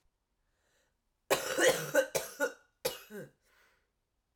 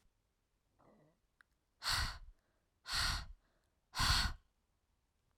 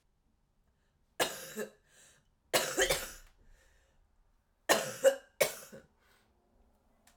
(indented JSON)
{
  "cough_length": "4.4 s",
  "cough_amplitude": 7072,
  "cough_signal_mean_std_ratio": 0.36,
  "exhalation_length": "5.4 s",
  "exhalation_amplitude": 3606,
  "exhalation_signal_mean_std_ratio": 0.37,
  "three_cough_length": "7.2 s",
  "three_cough_amplitude": 10933,
  "three_cough_signal_mean_std_ratio": 0.3,
  "survey_phase": "alpha (2021-03-01 to 2021-08-12)",
  "age": "18-44",
  "gender": "Female",
  "wearing_mask": "No",
  "symptom_cough_any": true,
  "symptom_headache": true,
  "smoker_status": "Ex-smoker",
  "respiratory_condition_asthma": false,
  "respiratory_condition_other": false,
  "recruitment_source": "Test and Trace",
  "submission_delay": "1 day",
  "covid_test_result": "Positive",
  "covid_test_method": "RT-qPCR",
  "covid_ct_value": 23.4,
  "covid_ct_gene": "ORF1ab gene",
  "covid_ct_mean": 24.0,
  "covid_viral_load": "14000 copies/ml",
  "covid_viral_load_category": "Low viral load (10K-1M copies/ml)"
}